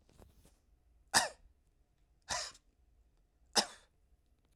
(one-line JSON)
{"three_cough_length": "4.6 s", "three_cough_amplitude": 9059, "three_cough_signal_mean_std_ratio": 0.23, "survey_phase": "alpha (2021-03-01 to 2021-08-12)", "age": "45-64", "gender": "Male", "wearing_mask": "No", "symptom_none": true, "smoker_status": "Never smoked", "respiratory_condition_asthma": false, "respiratory_condition_other": false, "recruitment_source": "REACT", "submission_delay": "3 days", "covid_test_result": "Negative", "covid_test_method": "RT-qPCR"}